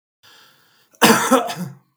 cough_length: 2.0 s
cough_amplitude: 32768
cough_signal_mean_std_ratio: 0.4
survey_phase: beta (2021-08-13 to 2022-03-07)
age: 65+
gender: Male
wearing_mask: 'No'
symptom_cough_any: true
symptom_runny_or_blocked_nose: true
smoker_status: Ex-smoker
respiratory_condition_asthma: false
respiratory_condition_other: false
recruitment_source: Test and Trace
submission_delay: 2 days
covid_test_result: Positive
covid_test_method: LFT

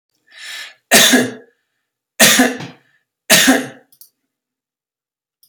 three_cough_length: 5.5 s
three_cough_amplitude: 32768
three_cough_signal_mean_std_ratio: 0.37
survey_phase: beta (2021-08-13 to 2022-03-07)
age: 45-64
gender: Male
wearing_mask: 'No'
symptom_none: true
smoker_status: Ex-smoker
respiratory_condition_asthma: false
respiratory_condition_other: false
recruitment_source: REACT
submission_delay: 2 days
covid_test_result: Negative
covid_test_method: RT-qPCR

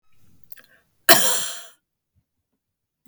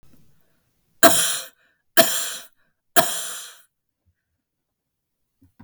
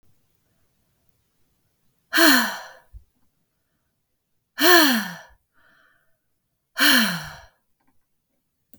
cough_length: 3.1 s
cough_amplitude: 32768
cough_signal_mean_std_ratio: 0.26
three_cough_length: 5.6 s
three_cough_amplitude: 32768
three_cough_signal_mean_std_ratio: 0.29
exhalation_length: 8.8 s
exhalation_amplitude: 31446
exhalation_signal_mean_std_ratio: 0.3
survey_phase: beta (2021-08-13 to 2022-03-07)
age: 45-64
gender: Female
wearing_mask: 'No'
symptom_sore_throat: true
smoker_status: Never smoked
respiratory_condition_asthma: false
respiratory_condition_other: false
recruitment_source: REACT
submission_delay: 1 day
covid_test_result: Negative
covid_test_method: RT-qPCR
influenza_a_test_result: Negative
influenza_b_test_result: Negative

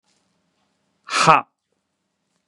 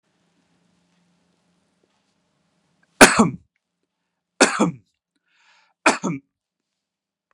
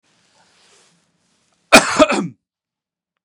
exhalation_length: 2.5 s
exhalation_amplitude: 32768
exhalation_signal_mean_std_ratio: 0.24
three_cough_length: 7.3 s
three_cough_amplitude: 32768
three_cough_signal_mean_std_ratio: 0.21
cough_length: 3.2 s
cough_amplitude: 32768
cough_signal_mean_std_ratio: 0.26
survey_phase: beta (2021-08-13 to 2022-03-07)
age: 45-64
gender: Male
wearing_mask: 'No'
symptom_none: true
smoker_status: Ex-smoker
respiratory_condition_asthma: false
respiratory_condition_other: false
recruitment_source: REACT
submission_delay: 1 day
covid_test_method: RT-qPCR
influenza_a_test_result: Unknown/Void
influenza_b_test_result: Unknown/Void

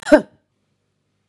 cough_length: 1.3 s
cough_amplitude: 32767
cough_signal_mean_std_ratio: 0.22
survey_phase: beta (2021-08-13 to 2022-03-07)
age: 18-44
gender: Female
wearing_mask: 'No'
symptom_none: true
smoker_status: Never smoked
respiratory_condition_asthma: false
respiratory_condition_other: false
recruitment_source: REACT
submission_delay: 6 days
covid_test_result: Negative
covid_test_method: RT-qPCR
influenza_a_test_result: Unknown/Void
influenza_b_test_result: Unknown/Void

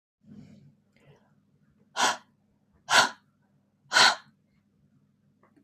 exhalation_length: 5.6 s
exhalation_amplitude: 17631
exhalation_signal_mean_std_ratio: 0.26
survey_phase: beta (2021-08-13 to 2022-03-07)
age: 45-64
gender: Female
wearing_mask: 'No'
symptom_none: true
smoker_status: Ex-smoker
respiratory_condition_asthma: false
respiratory_condition_other: false
recruitment_source: REACT
submission_delay: 6 days
covid_test_result: Negative
covid_test_method: RT-qPCR
influenza_a_test_result: Negative
influenza_b_test_result: Negative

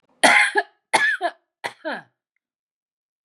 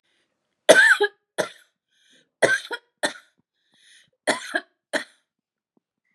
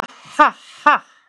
cough_length: 3.2 s
cough_amplitude: 32604
cough_signal_mean_std_ratio: 0.38
three_cough_length: 6.1 s
three_cough_amplitude: 32735
three_cough_signal_mean_std_ratio: 0.29
exhalation_length: 1.3 s
exhalation_amplitude: 32767
exhalation_signal_mean_std_ratio: 0.33
survey_phase: beta (2021-08-13 to 2022-03-07)
age: 18-44
gender: Female
wearing_mask: 'No'
symptom_none: true
smoker_status: Current smoker (1 to 10 cigarettes per day)
respiratory_condition_asthma: false
respiratory_condition_other: false
recruitment_source: REACT
submission_delay: 3 days
covid_test_result: Negative
covid_test_method: RT-qPCR
influenza_a_test_result: Negative
influenza_b_test_result: Negative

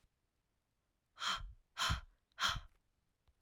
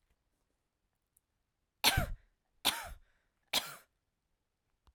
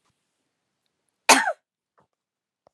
exhalation_length: 3.4 s
exhalation_amplitude: 2928
exhalation_signal_mean_std_ratio: 0.37
three_cough_length: 4.9 s
three_cough_amplitude: 7276
three_cough_signal_mean_std_ratio: 0.25
cough_length: 2.7 s
cough_amplitude: 32392
cough_signal_mean_std_ratio: 0.19
survey_phase: alpha (2021-03-01 to 2021-08-12)
age: 45-64
gender: Female
wearing_mask: 'No'
symptom_fatigue: true
symptom_headache: true
smoker_status: Never smoked
respiratory_condition_asthma: false
respiratory_condition_other: false
recruitment_source: REACT
submission_delay: 4 days
covid_test_result: Negative
covid_test_method: RT-qPCR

